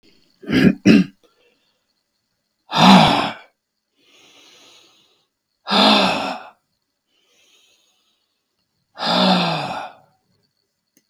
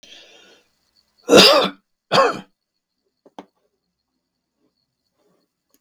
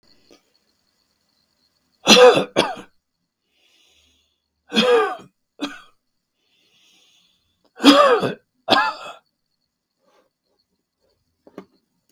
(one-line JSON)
{"exhalation_length": "11.1 s", "exhalation_amplitude": 32768, "exhalation_signal_mean_std_ratio": 0.36, "cough_length": "5.8 s", "cough_amplitude": 32768, "cough_signal_mean_std_ratio": 0.26, "three_cough_length": "12.1 s", "three_cough_amplitude": 32768, "three_cough_signal_mean_std_ratio": 0.28, "survey_phase": "beta (2021-08-13 to 2022-03-07)", "age": "65+", "gender": "Male", "wearing_mask": "No", "symptom_runny_or_blocked_nose": true, "symptom_sore_throat": true, "symptom_abdominal_pain": true, "symptom_fatigue": true, "symptom_onset": "11 days", "smoker_status": "Ex-smoker", "respiratory_condition_asthma": true, "respiratory_condition_other": false, "recruitment_source": "REACT", "submission_delay": "2 days", "covid_test_result": "Negative", "covid_test_method": "RT-qPCR", "influenza_a_test_result": "Unknown/Void", "influenza_b_test_result": "Unknown/Void"}